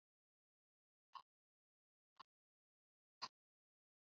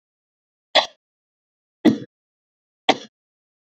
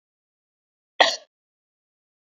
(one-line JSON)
{"exhalation_length": "4.0 s", "exhalation_amplitude": 578, "exhalation_signal_mean_std_ratio": 0.12, "three_cough_length": "3.7 s", "three_cough_amplitude": 27715, "three_cough_signal_mean_std_ratio": 0.2, "cough_length": "2.3 s", "cough_amplitude": 28997, "cough_signal_mean_std_ratio": 0.17, "survey_phase": "beta (2021-08-13 to 2022-03-07)", "age": "45-64", "gender": "Female", "wearing_mask": "No", "symptom_none": true, "smoker_status": "Never smoked", "respiratory_condition_asthma": true, "respiratory_condition_other": false, "recruitment_source": "REACT", "submission_delay": "1 day", "covid_test_result": "Negative", "covid_test_method": "RT-qPCR"}